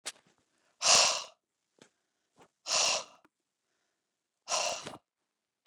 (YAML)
exhalation_length: 5.7 s
exhalation_amplitude: 9730
exhalation_signal_mean_std_ratio: 0.32
survey_phase: beta (2021-08-13 to 2022-03-07)
age: 45-64
gender: Female
wearing_mask: 'No'
symptom_fatigue: true
smoker_status: Ex-smoker
respiratory_condition_asthma: false
respiratory_condition_other: true
recruitment_source: REACT
submission_delay: 2 days
covid_test_result: Negative
covid_test_method: RT-qPCR
influenza_a_test_result: Unknown/Void
influenza_b_test_result: Unknown/Void